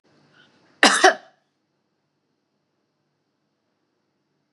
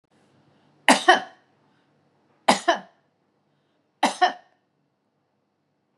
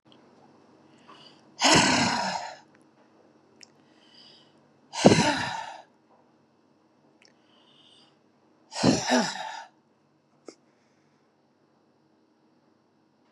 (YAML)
cough_length: 4.5 s
cough_amplitude: 32717
cough_signal_mean_std_ratio: 0.19
three_cough_length: 6.0 s
three_cough_amplitude: 30028
three_cough_signal_mean_std_ratio: 0.24
exhalation_length: 13.3 s
exhalation_amplitude: 32190
exhalation_signal_mean_std_ratio: 0.3
survey_phase: beta (2021-08-13 to 2022-03-07)
age: 65+
gender: Female
wearing_mask: 'No'
symptom_none: true
smoker_status: Never smoked
respiratory_condition_asthma: false
respiratory_condition_other: false
recruitment_source: REACT
submission_delay: 2 days
covid_test_result: Negative
covid_test_method: RT-qPCR
influenza_a_test_result: Unknown/Void
influenza_b_test_result: Unknown/Void